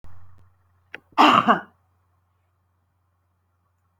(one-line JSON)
{"cough_length": "4.0 s", "cough_amplitude": 26982, "cough_signal_mean_std_ratio": 0.27, "survey_phase": "alpha (2021-03-01 to 2021-08-12)", "age": "65+", "gender": "Female", "wearing_mask": "No", "symptom_none": true, "smoker_status": "Ex-smoker", "respiratory_condition_asthma": false, "respiratory_condition_other": false, "recruitment_source": "REACT", "submission_delay": "2 days", "covid_test_result": "Negative", "covid_test_method": "RT-qPCR"}